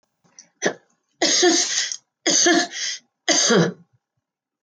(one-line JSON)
{"three_cough_length": "4.7 s", "three_cough_amplitude": 21037, "three_cough_signal_mean_std_ratio": 0.53, "survey_phase": "beta (2021-08-13 to 2022-03-07)", "age": "65+", "gender": "Female", "wearing_mask": "No", "symptom_none": true, "smoker_status": "Ex-smoker", "respiratory_condition_asthma": false, "respiratory_condition_other": false, "recruitment_source": "REACT", "submission_delay": "3 days", "covid_test_result": "Negative", "covid_test_method": "RT-qPCR"}